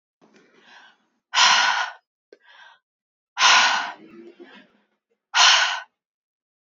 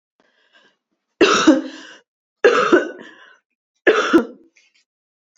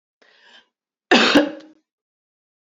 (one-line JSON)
{"exhalation_length": "6.7 s", "exhalation_amplitude": 28190, "exhalation_signal_mean_std_ratio": 0.38, "three_cough_length": "5.4 s", "three_cough_amplitude": 32768, "three_cough_signal_mean_std_ratio": 0.38, "cough_length": "2.7 s", "cough_amplitude": 28100, "cough_signal_mean_std_ratio": 0.3, "survey_phase": "beta (2021-08-13 to 2022-03-07)", "age": "18-44", "gender": "Female", "wearing_mask": "No", "symptom_cough_any": true, "symptom_new_continuous_cough": true, "symptom_runny_or_blocked_nose": true, "symptom_sore_throat": true, "symptom_fatigue": true, "symptom_headache": true, "symptom_onset": "5 days", "smoker_status": "Never smoked", "respiratory_condition_asthma": false, "respiratory_condition_other": false, "recruitment_source": "Test and Trace", "submission_delay": "2 days", "covid_test_result": "Positive", "covid_test_method": "RT-qPCR", "covid_ct_value": 28.2, "covid_ct_gene": "ORF1ab gene", "covid_ct_mean": 28.6, "covid_viral_load": "420 copies/ml", "covid_viral_load_category": "Minimal viral load (< 10K copies/ml)"}